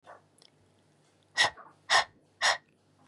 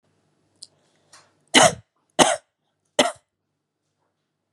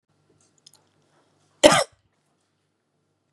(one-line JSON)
{"exhalation_length": "3.1 s", "exhalation_amplitude": 9381, "exhalation_signal_mean_std_ratio": 0.3, "three_cough_length": "4.5 s", "three_cough_amplitude": 32767, "three_cough_signal_mean_std_ratio": 0.23, "cough_length": "3.3 s", "cough_amplitude": 32767, "cough_signal_mean_std_ratio": 0.17, "survey_phase": "beta (2021-08-13 to 2022-03-07)", "age": "18-44", "gender": "Female", "wearing_mask": "No", "symptom_runny_or_blocked_nose": true, "symptom_fatigue": true, "smoker_status": "Never smoked", "respiratory_condition_asthma": false, "respiratory_condition_other": false, "recruitment_source": "REACT", "submission_delay": "2 days", "covid_test_result": "Negative", "covid_test_method": "RT-qPCR", "influenza_a_test_result": "Negative", "influenza_b_test_result": "Negative"}